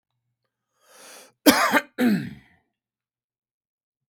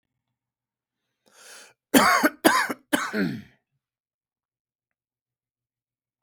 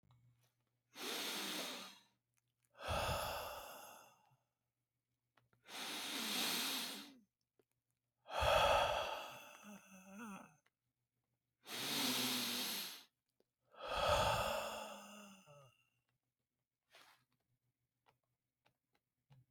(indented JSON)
{
  "cough_length": "4.1 s",
  "cough_amplitude": 32768,
  "cough_signal_mean_std_ratio": 0.3,
  "three_cough_length": "6.2 s",
  "three_cough_amplitude": 31826,
  "three_cough_signal_mean_std_ratio": 0.29,
  "exhalation_length": "19.5 s",
  "exhalation_amplitude": 2588,
  "exhalation_signal_mean_std_ratio": 0.47,
  "survey_phase": "beta (2021-08-13 to 2022-03-07)",
  "age": "45-64",
  "gender": "Male",
  "wearing_mask": "No",
  "symptom_shortness_of_breath": true,
  "symptom_headache": true,
  "symptom_change_to_sense_of_smell_or_taste": true,
  "symptom_onset": "10 days",
  "smoker_status": "Ex-smoker",
  "respiratory_condition_asthma": false,
  "respiratory_condition_other": false,
  "recruitment_source": "Test and Trace",
  "submission_delay": "2 days",
  "covid_test_result": "Positive",
  "covid_test_method": "RT-qPCR",
  "covid_ct_value": 27.0,
  "covid_ct_gene": "ORF1ab gene",
  "covid_ct_mean": 27.6,
  "covid_viral_load": "910 copies/ml",
  "covid_viral_load_category": "Minimal viral load (< 10K copies/ml)"
}